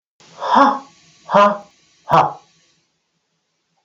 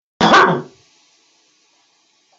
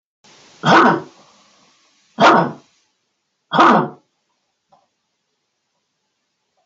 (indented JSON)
{
  "exhalation_length": "3.8 s",
  "exhalation_amplitude": 28165,
  "exhalation_signal_mean_std_ratio": 0.37,
  "cough_length": "2.4 s",
  "cough_amplitude": 30964,
  "cough_signal_mean_std_ratio": 0.34,
  "three_cough_length": "6.7 s",
  "three_cough_amplitude": 29246,
  "three_cough_signal_mean_std_ratio": 0.32,
  "survey_phase": "beta (2021-08-13 to 2022-03-07)",
  "age": "65+",
  "gender": "Male",
  "wearing_mask": "No",
  "symptom_diarrhoea": true,
  "symptom_fatigue": true,
  "symptom_onset": "12 days",
  "smoker_status": "Never smoked",
  "respiratory_condition_asthma": false,
  "respiratory_condition_other": false,
  "recruitment_source": "REACT",
  "submission_delay": "3 days",
  "covid_test_result": "Negative",
  "covid_test_method": "RT-qPCR"
}